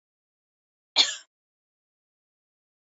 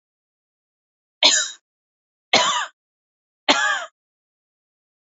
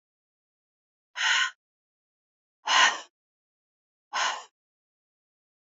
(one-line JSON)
{"cough_length": "2.9 s", "cough_amplitude": 15619, "cough_signal_mean_std_ratio": 0.16, "three_cough_length": "5.0 s", "three_cough_amplitude": 29900, "three_cough_signal_mean_std_ratio": 0.32, "exhalation_length": "5.6 s", "exhalation_amplitude": 12942, "exhalation_signal_mean_std_ratio": 0.3, "survey_phase": "beta (2021-08-13 to 2022-03-07)", "age": "45-64", "gender": "Female", "wearing_mask": "No", "symptom_none": true, "symptom_onset": "3 days", "smoker_status": "Never smoked", "respiratory_condition_asthma": false, "respiratory_condition_other": false, "recruitment_source": "REACT", "submission_delay": "2 days", "covid_test_result": "Negative", "covid_test_method": "RT-qPCR", "influenza_a_test_result": "Unknown/Void", "influenza_b_test_result": "Unknown/Void"}